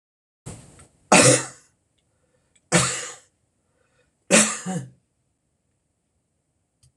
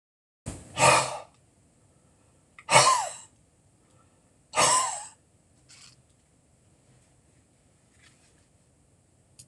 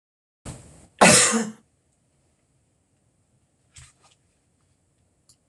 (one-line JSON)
{"three_cough_length": "7.0 s", "three_cough_amplitude": 26026, "three_cough_signal_mean_std_ratio": 0.28, "exhalation_length": "9.5 s", "exhalation_amplitude": 21812, "exhalation_signal_mean_std_ratio": 0.29, "cough_length": "5.5 s", "cough_amplitude": 26028, "cough_signal_mean_std_ratio": 0.23, "survey_phase": "beta (2021-08-13 to 2022-03-07)", "age": "65+", "gender": "Male", "wearing_mask": "No", "symptom_none": true, "smoker_status": "Never smoked", "respiratory_condition_asthma": false, "respiratory_condition_other": false, "recruitment_source": "REACT", "submission_delay": "2 days", "covid_test_result": "Negative", "covid_test_method": "RT-qPCR"}